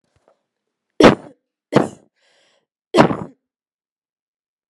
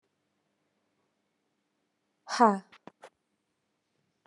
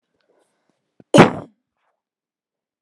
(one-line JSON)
{"three_cough_length": "4.7 s", "three_cough_amplitude": 32768, "three_cough_signal_mean_std_ratio": 0.23, "exhalation_length": "4.3 s", "exhalation_amplitude": 12980, "exhalation_signal_mean_std_ratio": 0.17, "cough_length": "2.8 s", "cough_amplitude": 32768, "cough_signal_mean_std_ratio": 0.19, "survey_phase": "alpha (2021-03-01 to 2021-08-12)", "age": "45-64", "gender": "Female", "wearing_mask": "No", "symptom_none": true, "smoker_status": "Ex-smoker", "respiratory_condition_asthma": false, "respiratory_condition_other": false, "recruitment_source": "REACT", "submission_delay": "3 days", "covid_test_result": "Negative", "covid_test_method": "RT-qPCR"}